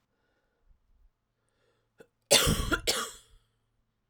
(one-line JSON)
{"cough_length": "4.1 s", "cough_amplitude": 14674, "cough_signal_mean_std_ratio": 0.3, "survey_phase": "alpha (2021-03-01 to 2021-08-12)", "age": "45-64", "gender": "Female", "wearing_mask": "No", "symptom_cough_any": true, "symptom_new_continuous_cough": true, "symptom_fatigue": true, "symptom_fever_high_temperature": true, "symptom_headache": true, "symptom_change_to_sense_of_smell_or_taste": true, "symptom_loss_of_taste": true, "symptom_onset": "5 days", "smoker_status": "Ex-smoker", "respiratory_condition_asthma": false, "respiratory_condition_other": false, "recruitment_source": "Test and Trace", "submission_delay": "2 days", "covid_test_result": "Positive", "covid_test_method": "RT-qPCR", "covid_ct_value": 18.5, "covid_ct_gene": "ORF1ab gene", "covid_ct_mean": 19.2, "covid_viral_load": "490000 copies/ml", "covid_viral_load_category": "Low viral load (10K-1M copies/ml)"}